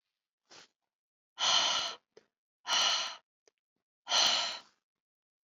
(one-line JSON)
{"exhalation_length": "5.5 s", "exhalation_amplitude": 6439, "exhalation_signal_mean_std_ratio": 0.42, "survey_phase": "beta (2021-08-13 to 2022-03-07)", "age": "45-64", "gender": "Female", "wearing_mask": "No", "symptom_cough_any": true, "symptom_sore_throat": true, "symptom_headache": true, "symptom_onset": "9 days", "smoker_status": "Never smoked", "respiratory_condition_asthma": false, "respiratory_condition_other": false, "recruitment_source": "Test and Trace", "submission_delay": "2 days", "covid_test_result": "Positive", "covid_test_method": "RT-qPCR", "covid_ct_value": 16.1, "covid_ct_gene": "ORF1ab gene", "covid_ct_mean": 16.4, "covid_viral_load": "4100000 copies/ml", "covid_viral_load_category": "High viral load (>1M copies/ml)"}